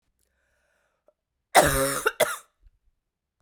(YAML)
cough_length: 3.4 s
cough_amplitude: 26843
cough_signal_mean_std_ratio: 0.31
survey_phase: beta (2021-08-13 to 2022-03-07)
age: 45-64
gender: Female
wearing_mask: 'No'
symptom_cough_any: true
symptom_runny_or_blocked_nose: true
symptom_shortness_of_breath: true
symptom_sore_throat: true
symptom_abdominal_pain: true
symptom_fatigue: true
symptom_headache: true
symptom_change_to_sense_of_smell_or_taste: true
symptom_other: true
symptom_onset: 4 days
smoker_status: Ex-smoker
respiratory_condition_asthma: false
respiratory_condition_other: false
recruitment_source: Test and Trace
submission_delay: 2 days
covid_test_result: Positive
covid_test_method: RT-qPCR
covid_ct_value: 18.3
covid_ct_gene: ORF1ab gene
covid_ct_mean: 18.8
covid_viral_load: 680000 copies/ml
covid_viral_load_category: Low viral load (10K-1M copies/ml)